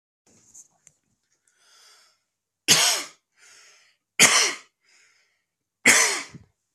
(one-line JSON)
{"three_cough_length": "6.7 s", "three_cough_amplitude": 32666, "three_cough_signal_mean_std_ratio": 0.3, "survey_phase": "beta (2021-08-13 to 2022-03-07)", "age": "18-44", "gender": "Male", "wearing_mask": "No", "symptom_cough_any": true, "symptom_new_continuous_cough": true, "symptom_runny_or_blocked_nose": true, "symptom_sore_throat": true, "symptom_fatigue": true, "symptom_fever_high_temperature": true, "symptom_other": true, "symptom_onset": "2 days", "smoker_status": "Ex-smoker", "respiratory_condition_asthma": false, "respiratory_condition_other": false, "recruitment_source": "Test and Trace", "submission_delay": "1 day", "covid_test_result": "Positive", "covid_test_method": "RT-qPCR", "covid_ct_value": 20.3, "covid_ct_gene": "ORF1ab gene"}